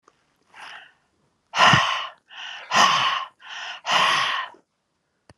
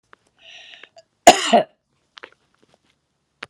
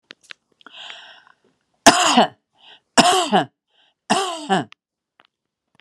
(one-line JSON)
{"exhalation_length": "5.4 s", "exhalation_amplitude": 25388, "exhalation_signal_mean_std_ratio": 0.47, "cough_length": "3.5 s", "cough_amplitude": 32768, "cough_signal_mean_std_ratio": 0.21, "three_cough_length": "5.8 s", "three_cough_amplitude": 32768, "three_cough_signal_mean_std_ratio": 0.35, "survey_phase": "alpha (2021-03-01 to 2021-08-12)", "age": "65+", "gender": "Female", "wearing_mask": "No", "symptom_none": true, "smoker_status": "Ex-smoker", "respiratory_condition_asthma": false, "respiratory_condition_other": false, "recruitment_source": "REACT", "submission_delay": "1 day", "covid_test_result": "Negative", "covid_test_method": "RT-qPCR"}